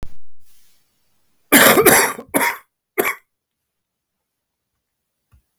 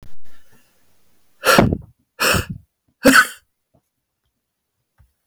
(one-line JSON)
{"cough_length": "5.6 s", "cough_amplitude": 32768, "cough_signal_mean_std_ratio": 0.37, "exhalation_length": "5.3 s", "exhalation_amplitude": 32768, "exhalation_signal_mean_std_ratio": 0.35, "survey_phase": "beta (2021-08-13 to 2022-03-07)", "age": "45-64", "gender": "Male", "wearing_mask": "No", "symptom_cough_any": true, "symptom_runny_or_blocked_nose": true, "symptom_fatigue": true, "symptom_headache": true, "symptom_change_to_sense_of_smell_or_taste": true, "symptom_loss_of_taste": true, "symptom_onset": "3 days", "smoker_status": "Never smoked", "respiratory_condition_asthma": false, "respiratory_condition_other": false, "recruitment_source": "Test and Trace", "submission_delay": "2 days", "covid_test_result": "Positive", "covid_test_method": "RT-qPCR", "covid_ct_value": 19.6, "covid_ct_gene": "ORF1ab gene", "covid_ct_mean": 20.3, "covid_viral_load": "210000 copies/ml", "covid_viral_load_category": "Low viral load (10K-1M copies/ml)"}